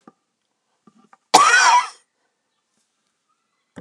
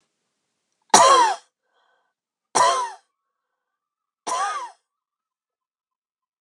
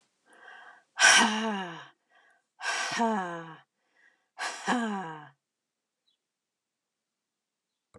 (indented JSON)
{
  "cough_length": "3.8 s",
  "cough_amplitude": 32768,
  "cough_signal_mean_std_ratio": 0.31,
  "three_cough_length": "6.4 s",
  "three_cough_amplitude": 32767,
  "three_cough_signal_mean_std_ratio": 0.31,
  "exhalation_length": "8.0 s",
  "exhalation_amplitude": 16699,
  "exhalation_signal_mean_std_ratio": 0.36,
  "survey_phase": "alpha (2021-03-01 to 2021-08-12)",
  "age": "45-64",
  "gender": "Female",
  "wearing_mask": "No",
  "symptom_none": true,
  "smoker_status": "Never smoked",
  "respiratory_condition_asthma": false,
  "respiratory_condition_other": false,
  "recruitment_source": "REACT",
  "submission_delay": "1 day",
  "covid_test_result": "Negative",
  "covid_test_method": "RT-qPCR"
}